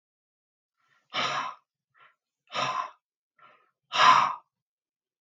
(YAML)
exhalation_length: 5.2 s
exhalation_amplitude: 16111
exhalation_signal_mean_std_ratio: 0.31
survey_phase: beta (2021-08-13 to 2022-03-07)
age: 45-64
gender: Male
wearing_mask: 'No'
symptom_none: true
smoker_status: Ex-smoker
respiratory_condition_asthma: false
respiratory_condition_other: false
recruitment_source: REACT
submission_delay: 3 days
covid_test_result: Negative
covid_test_method: RT-qPCR
influenza_a_test_result: Negative
influenza_b_test_result: Negative